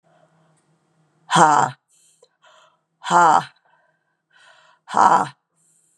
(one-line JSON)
{"exhalation_length": "6.0 s", "exhalation_amplitude": 29925, "exhalation_signal_mean_std_ratio": 0.32, "survey_phase": "beta (2021-08-13 to 2022-03-07)", "age": "45-64", "gender": "Female", "wearing_mask": "No", "symptom_cough_any": true, "symptom_sore_throat": true, "symptom_fatigue": true, "symptom_fever_high_temperature": true, "symptom_headache": true, "symptom_onset": "7 days", "smoker_status": "Never smoked", "respiratory_condition_asthma": true, "respiratory_condition_other": false, "recruitment_source": "Test and Trace", "submission_delay": "2 days", "covid_test_result": "Positive", "covid_test_method": "RT-qPCR", "covid_ct_value": 22.6, "covid_ct_gene": "ORF1ab gene", "covid_ct_mean": 22.9, "covid_viral_load": "30000 copies/ml", "covid_viral_load_category": "Low viral load (10K-1M copies/ml)"}